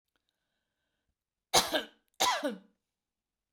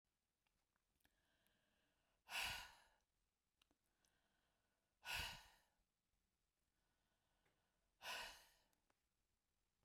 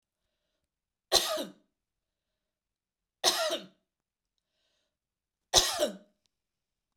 {"cough_length": "3.5 s", "cough_amplitude": 10322, "cough_signal_mean_std_ratio": 0.3, "exhalation_length": "9.8 s", "exhalation_amplitude": 633, "exhalation_signal_mean_std_ratio": 0.28, "three_cough_length": "7.0 s", "three_cough_amplitude": 18239, "three_cough_signal_mean_std_ratio": 0.27, "survey_phase": "beta (2021-08-13 to 2022-03-07)", "age": "65+", "gender": "Female", "wearing_mask": "No", "symptom_none": true, "smoker_status": "Never smoked", "respiratory_condition_asthma": false, "respiratory_condition_other": false, "recruitment_source": "REACT", "submission_delay": "0 days", "covid_test_result": "Negative", "covid_test_method": "RT-qPCR"}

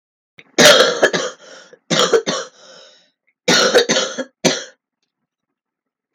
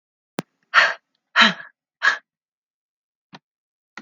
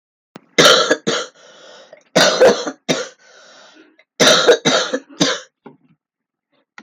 {"cough_length": "6.1 s", "cough_amplitude": 32768, "cough_signal_mean_std_ratio": 0.43, "exhalation_length": "4.0 s", "exhalation_amplitude": 32768, "exhalation_signal_mean_std_ratio": 0.27, "three_cough_length": "6.8 s", "three_cough_amplitude": 32768, "three_cough_signal_mean_std_ratio": 0.44, "survey_phase": "beta (2021-08-13 to 2022-03-07)", "age": "18-44", "gender": "Female", "wearing_mask": "No", "symptom_cough_any": true, "symptom_runny_or_blocked_nose": true, "symptom_shortness_of_breath": true, "symptom_sore_throat": true, "symptom_fatigue": true, "symptom_headache": true, "smoker_status": "Ex-smoker", "respiratory_condition_asthma": true, "respiratory_condition_other": false, "recruitment_source": "Test and Trace", "submission_delay": "2 days", "covid_test_result": "Positive", "covid_test_method": "RT-qPCR"}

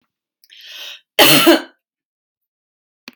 {"cough_length": "3.2 s", "cough_amplitude": 32768, "cough_signal_mean_std_ratio": 0.31, "survey_phase": "beta (2021-08-13 to 2022-03-07)", "age": "45-64", "gender": "Female", "wearing_mask": "No", "symptom_none": true, "smoker_status": "Never smoked", "respiratory_condition_asthma": false, "respiratory_condition_other": false, "recruitment_source": "REACT", "submission_delay": "1 day", "covid_test_result": "Negative", "covid_test_method": "RT-qPCR"}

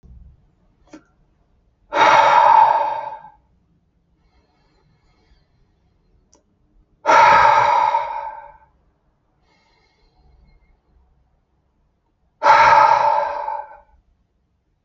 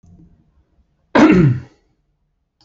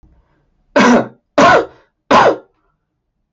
{"exhalation_length": "14.8 s", "exhalation_amplitude": 28641, "exhalation_signal_mean_std_ratio": 0.39, "cough_length": "2.6 s", "cough_amplitude": 28771, "cough_signal_mean_std_ratio": 0.35, "three_cough_length": "3.3 s", "three_cough_amplitude": 29176, "three_cough_signal_mean_std_ratio": 0.45, "survey_phase": "alpha (2021-03-01 to 2021-08-12)", "age": "18-44", "gender": "Male", "wearing_mask": "No", "symptom_none": true, "smoker_status": "Ex-smoker", "respiratory_condition_asthma": false, "respiratory_condition_other": false, "recruitment_source": "REACT", "submission_delay": "3 days", "covid_test_result": "Negative", "covid_test_method": "RT-qPCR"}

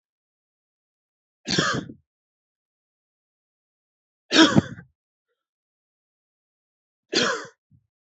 {"three_cough_length": "8.1 s", "three_cough_amplitude": 27071, "three_cough_signal_mean_std_ratio": 0.23, "survey_phase": "beta (2021-08-13 to 2022-03-07)", "age": "18-44", "gender": "Male", "wearing_mask": "No", "symptom_headache": true, "symptom_onset": "3 days", "smoker_status": "Never smoked", "respiratory_condition_asthma": false, "respiratory_condition_other": false, "recruitment_source": "REACT", "submission_delay": "2 days", "covid_test_result": "Negative", "covid_test_method": "RT-qPCR", "influenza_a_test_result": "Negative", "influenza_b_test_result": "Negative"}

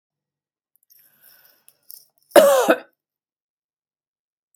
{"three_cough_length": "4.6 s", "three_cough_amplitude": 32767, "three_cough_signal_mean_std_ratio": 0.23, "survey_phase": "beta (2021-08-13 to 2022-03-07)", "age": "65+", "gender": "Female", "wearing_mask": "No", "symptom_none": true, "smoker_status": "Ex-smoker", "respiratory_condition_asthma": false, "respiratory_condition_other": false, "recruitment_source": "REACT", "submission_delay": "8 days", "covid_test_result": "Negative", "covid_test_method": "RT-qPCR", "influenza_a_test_result": "Negative", "influenza_b_test_result": "Negative"}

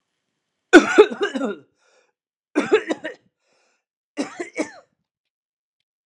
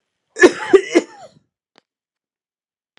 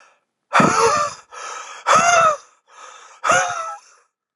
{"three_cough_length": "6.1 s", "three_cough_amplitude": 32768, "three_cough_signal_mean_std_ratio": 0.26, "cough_length": "3.0 s", "cough_amplitude": 32768, "cough_signal_mean_std_ratio": 0.25, "exhalation_length": "4.4 s", "exhalation_amplitude": 29640, "exhalation_signal_mean_std_ratio": 0.53, "survey_phase": "beta (2021-08-13 to 2022-03-07)", "age": "18-44", "gender": "Male", "wearing_mask": "No", "symptom_cough_any": true, "symptom_runny_or_blocked_nose": true, "symptom_sore_throat": true, "symptom_change_to_sense_of_smell_or_taste": true, "symptom_onset": "6 days", "smoker_status": "Never smoked", "respiratory_condition_asthma": false, "respiratory_condition_other": false, "recruitment_source": "Test and Trace", "submission_delay": "2 days", "covid_test_result": "Positive", "covid_test_method": "RT-qPCR", "covid_ct_value": 11.3, "covid_ct_gene": "N gene", "covid_ct_mean": 11.9, "covid_viral_load": "130000000 copies/ml", "covid_viral_load_category": "High viral load (>1M copies/ml)"}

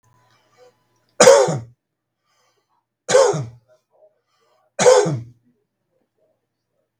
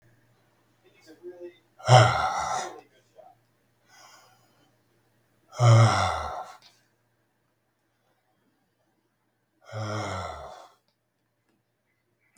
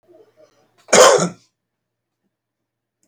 {"three_cough_length": "7.0 s", "three_cough_amplitude": 32768, "three_cough_signal_mean_std_ratio": 0.3, "exhalation_length": "12.4 s", "exhalation_amplitude": 24489, "exhalation_signal_mean_std_ratio": 0.29, "cough_length": "3.1 s", "cough_amplitude": 32768, "cough_signal_mean_std_ratio": 0.27, "survey_phase": "beta (2021-08-13 to 2022-03-07)", "age": "65+", "gender": "Male", "wearing_mask": "No", "symptom_none": true, "smoker_status": "Current smoker (1 to 10 cigarettes per day)", "respiratory_condition_asthma": false, "respiratory_condition_other": false, "recruitment_source": "REACT", "submission_delay": "1 day", "covid_test_result": "Negative", "covid_test_method": "RT-qPCR", "influenza_a_test_result": "Negative", "influenza_b_test_result": "Negative"}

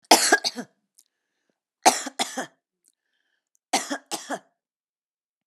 {"three_cough_length": "5.5 s", "three_cough_amplitude": 32767, "three_cough_signal_mean_std_ratio": 0.27, "survey_phase": "alpha (2021-03-01 to 2021-08-12)", "age": "65+", "gender": "Female", "wearing_mask": "No", "symptom_none": true, "symptom_onset": "2 days", "smoker_status": "Never smoked", "respiratory_condition_asthma": false, "respiratory_condition_other": false, "recruitment_source": "REACT", "submission_delay": "2 days", "covid_test_result": "Negative", "covid_test_method": "RT-qPCR"}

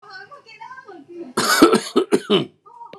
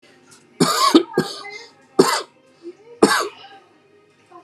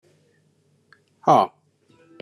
{"cough_length": "3.0 s", "cough_amplitude": 32768, "cough_signal_mean_std_ratio": 0.45, "three_cough_length": "4.4 s", "three_cough_amplitude": 32767, "three_cough_signal_mean_std_ratio": 0.38, "exhalation_length": "2.2 s", "exhalation_amplitude": 24782, "exhalation_signal_mean_std_ratio": 0.23, "survey_phase": "beta (2021-08-13 to 2022-03-07)", "age": "45-64", "gender": "Male", "wearing_mask": "No", "symptom_none": true, "smoker_status": "Ex-smoker", "respiratory_condition_asthma": false, "respiratory_condition_other": false, "recruitment_source": "REACT", "submission_delay": "2 days", "covid_test_result": "Negative", "covid_test_method": "RT-qPCR", "influenza_a_test_result": "Unknown/Void", "influenza_b_test_result": "Unknown/Void"}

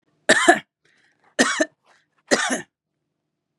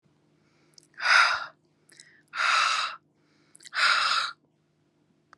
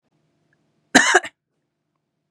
{"three_cough_length": "3.6 s", "three_cough_amplitude": 31601, "three_cough_signal_mean_std_ratio": 0.34, "exhalation_length": "5.4 s", "exhalation_amplitude": 15704, "exhalation_signal_mean_std_ratio": 0.44, "cough_length": "2.3 s", "cough_amplitude": 32767, "cough_signal_mean_std_ratio": 0.24, "survey_phase": "beta (2021-08-13 to 2022-03-07)", "age": "45-64", "gender": "Female", "wearing_mask": "No", "symptom_none": true, "smoker_status": "Ex-smoker", "respiratory_condition_asthma": false, "respiratory_condition_other": false, "recruitment_source": "REACT", "submission_delay": "1 day", "covid_test_result": "Negative", "covid_test_method": "RT-qPCR", "influenza_a_test_result": "Negative", "influenza_b_test_result": "Negative"}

